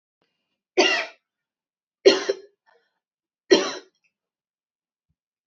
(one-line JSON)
{"three_cough_length": "5.5 s", "three_cough_amplitude": 26824, "three_cough_signal_mean_std_ratio": 0.25, "survey_phase": "beta (2021-08-13 to 2022-03-07)", "age": "18-44", "gender": "Female", "wearing_mask": "No", "symptom_none": true, "smoker_status": "Never smoked", "respiratory_condition_asthma": false, "respiratory_condition_other": false, "recruitment_source": "REACT", "submission_delay": "2 days", "covid_test_result": "Negative", "covid_test_method": "RT-qPCR", "influenza_a_test_result": "Negative", "influenza_b_test_result": "Negative"}